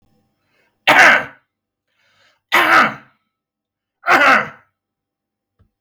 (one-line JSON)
{"three_cough_length": "5.8 s", "three_cough_amplitude": 32766, "three_cough_signal_mean_std_ratio": 0.36, "survey_phase": "beta (2021-08-13 to 2022-03-07)", "age": "45-64", "gender": "Male", "wearing_mask": "No", "symptom_cough_any": true, "symptom_runny_or_blocked_nose": true, "smoker_status": "Ex-smoker", "respiratory_condition_asthma": false, "respiratory_condition_other": false, "recruitment_source": "REACT", "submission_delay": "2 days", "covid_test_result": "Negative", "covid_test_method": "RT-qPCR"}